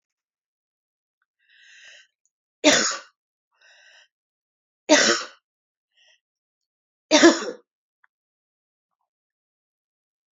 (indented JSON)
{
  "three_cough_length": "10.3 s",
  "three_cough_amplitude": 32430,
  "three_cough_signal_mean_std_ratio": 0.22,
  "survey_phase": "beta (2021-08-13 to 2022-03-07)",
  "age": "18-44",
  "gender": "Female",
  "wearing_mask": "No",
  "symptom_cough_any": true,
  "symptom_runny_or_blocked_nose": true,
  "symptom_sore_throat": true,
  "smoker_status": "Never smoked",
  "respiratory_condition_asthma": false,
  "respiratory_condition_other": false,
  "recruitment_source": "Test and Trace",
  "submission_delay": "2 days",
  "covid_test_result": "Positive",
  "covid_test_method": "RT-qPCR",
  "covid_ct_value": 29.9,
  "covid_ct_gene": "ORF1ab gene"
}